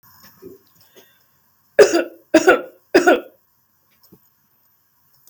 three_cough_length: 5.3 s
three_cough_amplitude: 32768
three_cough_signal_mean_std_ratio: 0.28
survey_phase: beta (2021-08-13 to 2022-03-07)
age: 45-64
gender: Female
wearing_mask: 'No'
symptom_none: true
smoker_status: Ex-smoker
respiratory_condition_asthma: false
respiratory_condition_other: false
recruitment_source: REACT
submission_delay: 1 day
covid_test_result: Negative
covid_test_method: RT-qPCR
influenza_a_test_result: Negative
influenza_b_test_result: Negative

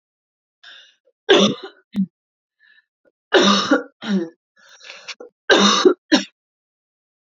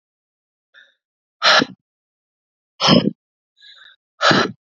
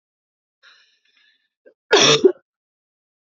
three_cough_length: 7.3 s
three_cough_amplitude: 31937
three_cough_signal_mean_std_ratio: 0.38
exhalation_length: 4.8 s
exhalation_amplitude: 32767
exhalation_signal_mean_std_ratio: 0.32
cough_length: 3.3 s
cough_amplitude: 29956
cough_signal_mean_std_ratio: 0.26
survey_phase: beta (2021-08-13 to 2022-03-07)
age: 18-44
gender: Female
wearing_mask: 'No'
symptom_cough_any: true
symptom_runny_or_blocked_nose: true
symptom_sore_throat: true
symptom_fatigue: true
symptom_headache: true
symptom_onset: 3 days
smoker_status: Never smoked
respiratory_condition_asthma: false
respiratory_condition_other: false
recruitment_source: Test and Trace
submission_delay: 2 days
covid_test_result: Positive
covid_test_method: RT-qPCR
covid_ct_value: 18.1
covid_ct_gene: ORF1ab gene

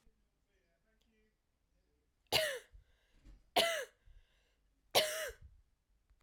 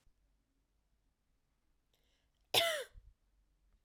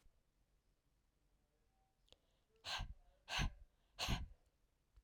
three_cough_length: 6.2 s
three_cough_amplitude: 5927
three_cough_signal_mean_std_ratio: 0.29
cough_length: 3.8 s
cough_amplitude: 5535
cough_signal_mean_std_ratio: 0.22
exhalation_length: 5.0 s
exhalation_amplitude: 1227
exhalation_signal_mean_std_ratio: 0.33
survey_phase: alpha (2021-03-01 to 2021-08-12)
age: 18-44
gender: Female
wearing_mask: 'No'
symptom_fatigue: true
smoker_status: Never smoked
respiratory_condition_asthma: false
respiratory_condition_other: false
recruitment_source: Test and Trace
submission_delay: 1 day
covid_test_result: Positive
covid_test_method: RT-qPCR
covid_ct_value: 27.7
covid_ct_gene: ORF1ab gene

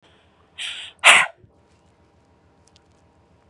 exhalation_length: 3.5 s
exhalation_amplitude: 32768
exhalation_signal_mean_std_ratio: 0.23
survey_phase: beta (2021-08-13 to 2022-03-07)
age: 18-44
gender: Female
wearing_mask: 'No'
symptom_none: true
smoker_status: Current smoker (1 to 10 cigarettes per day)
respiratory_condition_asthma: false
respiratory_condition_other: false
recruitment_source: REACT
submission_delay: 2 days
covid_test_result: Negative
covid_test_method: RT-qPCR
influenza_a_test_result: Negative
influenza_b_test_result: Negative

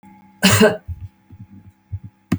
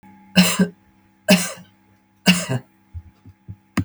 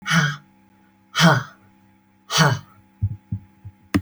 cough_length: 2.4 s
cough_amplitude: 32767
cough_signal_mean_std_ratio: 0.37
three_cough_length: 3.8 s
three_cough_amplitude: 31306
three_cough_signal_mean_std_ratio: 0.37
exhalation_length: 4.0 s
exhalation_amplitude: 26885
exhalation_signal_mean_std_ratio: 0.42
survey_phase: beta (2021-08-13 to 2022-03-07)
age: 45-64
gender: Female
wearing_mask: 'No'
symptom_cough_any: true
symptom_sore_throat: true
smoker_status: Never smoked
respiratory_condition_asthma: false
respiratory_condition_other: false
recruitment_source: REACT
submission_delay: 1 day
covid_test_result: Negative
covid_test_method: RT-qPCR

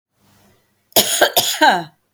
three_cough_length: 2.1 s
three_cough_amplitude: 32768
three_cough_signal_mean_std_ratio: 0.46
survey_phase: beta (2021-08-13 to 2022-03-07)
age: 65+
gender: Female
wearing_mask: 'No'
symptom_none: true
smoker_status: Never smoked
respiratory_condition_asthma: false
respiratory_condition_other: false
recruitment_source: REACT
submission_delay: 2 days
covid_test_result: Negative
covid_test_method: RT-qPCR
influenza_a_test_result: Negative
influenza_b_test_result: Negative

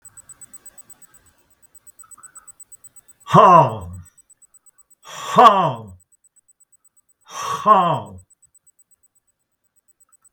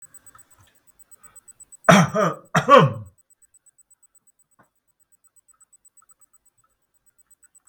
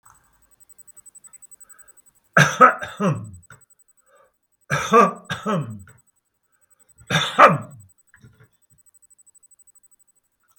exhalation_length: 10.3 s
exhalation_amplitude: 32768
exhalation_signal_mean_std_ratio: 0.29
cough_length: 7.7 s
cough_amplitude: 32768
cough_signal_mean_std_ratio: 0.24
three_cough_length: 10.6 s
three_cough_amplitude: 32768
three_cough_signal_mean_std_ratio: 0.28
survey_phase: beta (2021-08-13 to 2022-03-07)
age: 65+
gender: Male
wearing_mask: 'No'
symptom_none: true
smoker_status: Never smoked
respiratory_condition_asthma: false
respiratory_condition_other: false
recruitment_source: REACT
submission_delay: 4 days
covid_test_result: Negative
covid_test_method: RT-qPCR
influenza_a_test_result: Negative
influenza_b_test_result: Negative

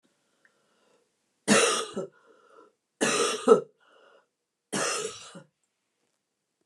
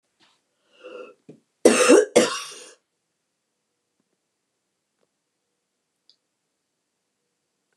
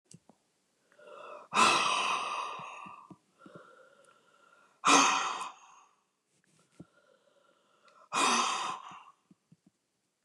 three_cough_length: 6.7 s
three_cough_amplitude: 20809
three_cough_signal_mean_std_ratio: 0.33
cough_length: 7.8 s
cough_amplitude: 29203
cough_signal_mean_std_ratio: 0.22
exhalation_length: 10.2 s
exhalation_amplitude: 13382
exhalation_signal_mean_std_ratio: 0.38
survey_phase: beta (2021-08-13 to 2022-03-07)
age: 65+
gender: Female
wearing_mask: 'No'
symptom_cough_any: true
symptom_runny_or_blocked_nose: true
symptom_sore_throat: true
symptom_change_to_sense_of_smell_or_taste: true
symptom_onset: 3 days
smoker_status: Never smoked
respiratory_condition_asthma: false
respiratory_condition_other: false
recruitment_source: Test and Trace
submission_delay: 2 days
covid_test_result: Positive
covid_test_method: RT-qPCR
covid_ct_value: 16.8
covid_ct_gene: ORF1ab gene
covid_ct_mean: 17.4
covid_viral_load: 2000000 copies/ml
covid_viral_load_category: High viral load (>1M copies/ml)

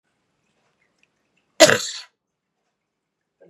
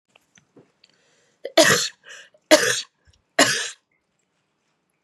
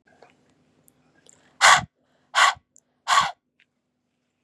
cough_length: 3.5 s
cough_amplitude: 32768
cough_signal_mean_std_ratio: 0.18
three_cough_length: 5.0 s
three_cough_amplitude: 32767
three_cough_signal_mean_std_ratio: 0.3
exhalation_length: 4.4 s
exhalation_amplitude: 29376
exhalation_signal_mean_std_ratio: 0.28
survey_phase: beta (2021-08-13 to 2022-03-07)
age: 18-44
gender: Female
wearing_mask: 'No'
symptom_cough_any: true
symptom_new_continuous_cough: true
symptom_runny_or_blocked_nose: true
symptom_shortness_of_breath: true
symptom_sore_throat: true
symptom_fatigue: true
symptom_onset: 4 days
smoker_status: Never smoked
respiratory_condition_asthma: false
respiratory_condition_other: false
recruitment_source: Test and Trace
submission_delay: 1 day
covid_test_result: Positive
covid_test_method: ePCR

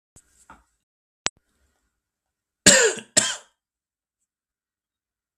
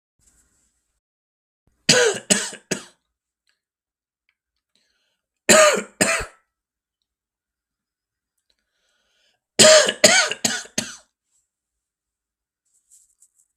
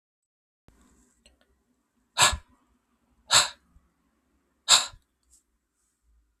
cough_length: 5.4 s
cough_amplitude: 32768
cough_signal_mean_std_ratio: 0.21
three_cough_length: 13.6 s
three_cough_amplitude: 32768
three_cough_signal_mean_std_ratio: 0.27
exhalation_length: 6.4 s
exhalation_amplitude: 32366
exhalation_signal_mean_std_ratio: 0.21
survey_phase: beta (2021-08-13 to 2022-03-07)
age: 45-64
gender: Male
wearing_mask: 'No'
symptom_cough_any: true
symptom_shortness_of_breath: true
symptom_sore_throat: true
smoker_status: Never smoked
respiratory_condition_asthma: false
respiratory_condition_other: false
recruitment_source: Test and Trace
submission_delay: 2 days
covid_test_result: Positive
covid_test_method: RT-qPCR
covid_ct_value: 31.0
covid_ct_gene: N gene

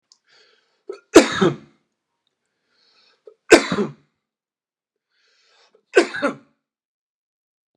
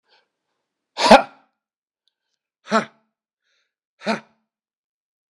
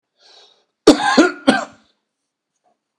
three_cough_length: 7.8 s
three_cough_amplitude: 32768
three_cough_signal_mean_std_ratio: 0.22
exhalation_length: 5.4 s
exhalation_amplitude: 32768
exhalation_signal_mean_std_ratio: 0.19
cough_length: 3.0 s
cough_amplitude: 32768
cough_signal_mean_std_ratio: 0.31
survey_phase: beta (2021-08-13 to 2022-03-07)
age: 65+
gender: Male
wearing_mask: 'No'
symptom_none: true
smoker_status: Ex-smoker
respiratory_condition_asthma: false
respiratory_condition_other: false
recruitment_source: REACT
submission_delay: 2 days
covid_test_result: Negative
covid_test_method: RT-qPCR
influenza_a_test_result: Negative
influenza_b_test_result: Negative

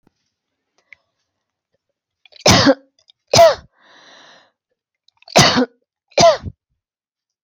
cough_length: 7.4 s
cough_amplitude: 32768
cough_signal_mean_std_ratio: 0.3
survey_phase: alpha (2021-03-01 to 2021-08-12)
age: 45-64
gender: Female
wearing_mask: 'No'
symptom_none: true
smoker_status: Never smoked
respiratory_condition_asthma: false
respiratory_condition_other: false
recruitment_source: REACT
submission_delay: 2 days
covid_test_result: Negative
covid_test_method: RT-qPCR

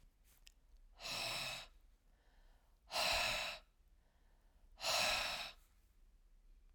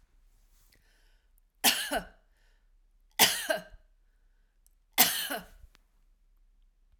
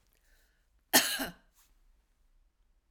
exhalation_length: 6.7 s
exhalation_amplitude: 2092
exhalation_signal_mean_std_ratio: 0.49
three_cough_length: 7.0 s
three_cough_amplitude: 16931
three_cough_signal_mean_std_ratio: 0.29
cough_length: 2.9 s
cough_amplitude: 13687
cough_signal_mean_std_ratio: 0.23
survey_phase: alpha (2021-03-01 to 2021-08-12)
age: 65+
gender: Female
wearing_mask: 'No'
symptom_none: true
smoker_status: Never smoked
respiratory_condition_asthma: false
respiratory_condition_other: false
recruitment_source: REACT
submission_delay: 1 day
covid_test_result: Negative
covid_test_method: RT-qPCR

